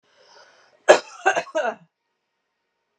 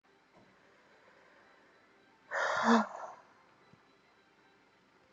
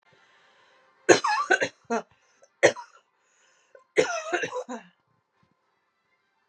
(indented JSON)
{
  "cough_length": "3.0 s",
  "cough_amplitude": 32768,
  "cough_signal_mean_std_ratio": 0.25,
  "exhalation_length": "5.1 s",
  "exhalation_amplitude": 6603,
  "exhalation_signal_mean_std_ratio": 0.29,
  "three_cough_length": "6.5 s",
  "three_cough_amplitude": 31111,
  "three_cough_signal_mean_std_ratio": 0.3,
  "survey_phase": "beta (2021-08-13 to 2022-03-07)",
  "age": "18-44",
  "gender": "Female",
  "wearing_mask": "No",
  "symptom_none": true,
  "smoker_status": "Never smoked",
  "respiratory_condition_asthma": false,
  "respiratory_condition_other": false,
  "recruitment_source": "REACT",
  "submission_delay": "1 day",
  "covid_test_result": "Negative",
  "covid_test_method": "RT-qPCR"
}